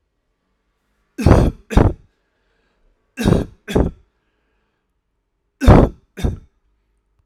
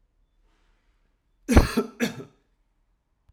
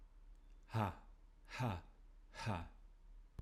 {"three_cough_length": "7.3 s", "three_cough_amplitude": 32768, "three_cough_signal_mean_std_ratio": 0.31, "cough_length": "3.3 s", "cough_amplitude": 26032, "cough_signal_mean_std_ratio": 0.25, "exhalation_length": "3.4 s", "exhalation_amplitude": 1896, "exhalation_signal_mean_std_ratio": 0.56, "survey_phase": "alpha (2021-03-01 to 2021-08-12)", "age": "18-44", "gender": "Male", "wearing_mask": "No", "symptom_none": true, "smoker_status": "Never smoked", "respiratory_condition_asthma": false, "respiratory_condition_other": false, "recruitment_source": "REACT", "submission_delay": "1 day", "covid_test_result": "Negative", "covid_test_method": "RT-qPCR"}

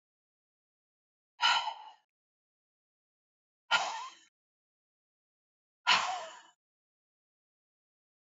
{"exhalation_length": "8.3 s", "exhalation_amplitude": 7607, "exhalation_signal_mean_std_ratio": 0.26, "survey_phase": "beta (2021-08-13 to 2022-03-07)", "age": "45-64", "gender": "Female", "wearing_mask": "No", "symptom_none": true, "smoker_status": "Ex-smoker", "respiratory_condition_asthma": false, "respiratory_condition_other": false, "recruitment_source": "REACT", "submission_delay": "0 days", "covid_test_result": "Negative", "covid_test_method": "RT-qPCR", "influenza_a_test_result": "Negative", "influenza_b_test_result": "Negative"}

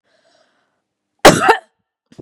{"cough_length": "2.2 s", "cough_amplitude": 32768, "cough_signal_mean_std_ratio": 0.27, "survey_phase": "beta (2021-08-13 to 2022-03-07)", "age": "45-64", "gender": "Female", "wearing_mask": "No", "symptom_none": true, "smoker_status": "Never smoked", "respiratory_condition_asthma": false, "respiratory_condition_other": false, "recruitment_source": "REACT", "submission_delay": "1 day", "covid_test_result": "Negative", "covid_test_method": "RT-qPCR", "influenza_a_test_result": "Negative", "influenza_b_test_result": "Negative"}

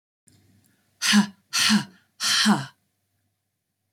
{"exhalation_length": "3.9 s", "exhalation_amplitude": 14828, "exhalation_signal_mean_std_ratio": 0.41, "survey_phase": "beta (2021-08-13 to 2022-03-07)", "age": "18-44", "gender": "Female", "wearing_mask": "Yes", "symptom_cough_any": true, "symptom_runny_or_blocked_nose": true, "symptom_onset": "8 days", "smoker_status": "Never smoked", "respiratory_condition_asthma": false, "respiratory_condition_other": false, "recruitment_source": "REACT", "submission_delay": "1 day", "covid_test_result": "Negative", "covid_test_method": "RT-qPCR"}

